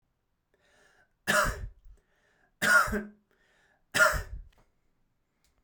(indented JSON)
{
  "three_cough_length": "5.6 s",
  "three_cough_amplitude": 10183,
  "three_cough_signal_mean_std_ratio": 0.34,
  "survey_phase": "beta (2021-08-13 to 2022-03-07)",
  "age": "18-44",
  "gender": "Male",
  "wearing_mask": "No",
  "symptom_none": true,
  "smoker_status": "Never smoked",
  "respiratory_condition_asthma": false,
  "respiratory_condition_other": false,
  "recruitment_source": "REACT",
  "submission_delay": "0 days",
  "covid_test_result": "Negative",
  "covid_test_method": "RT-qPCR"
}